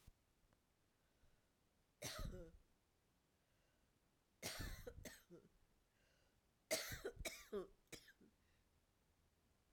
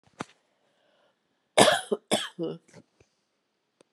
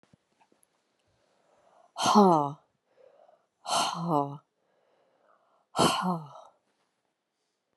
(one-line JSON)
{"three_cough_length": "9.7 s", "three_cough_amplitude": 1200, "three_cough_signal_mean_std_ratio": 0.39, "cough_length": "3.9 s", "cough_amplitude": 28120, "cough_signal_mean_std_ratio": 0.26, "exhalation_length": "7.8 s", "exhalation_amplitude": 13265, "exhalation_signal_mean_std_ratio": 0.33, "survey_phase": "alpha (2021-03-01 to 2021-08-12)", "age": "65+", "gender": "Female", "wearing_mask": "No", "symptom_cough_any": true, "symptom_new_continuous_cough": true, "symptom_shortness_of_breath": true, "symptom_fatigue": true, "symptom_headache": true, "symptom_onset": "3 days", "smoker_status": "Ex-smoker", "respiratory_condition_asthma": false, "respiratory_condition_other": false, "recruitment_source": "Test and Trace", "submission_delay": "2 days", "covid_test_result": "Positive", "covid_test_method": "RT-qPCR", "covid_ct_value": 26.4, "covid_ct_gene": "ORF1ab gene"}